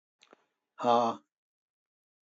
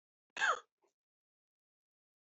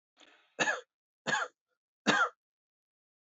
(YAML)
exhalation_length: 2.3 s
exhalation_amplitude: 9473
exhalation_signal_mean_std_ratio: 0.29
cough_length: 2.3 s
cough_amplitude: 2650
cough_signal_mean_std_ratio: 0.23
three_cough_length: 3.2 s
three_cough_amplitude: 8588
three_cough_signal_mean_std_ratio: 0.34
survey_phase: alpha (2021-03-01 to 2021-08-12)
age: 65+
gender: Male
wearing_mask: 'No'
symptom_none: true
smoker_status: Never smoked
respiratory_condition_asthma: false
respiratory_condition_other: false
recruitment_source: REACT
submission_delay: 0 days
covid_test_result: Negative
covid_test_method: RT-qPCR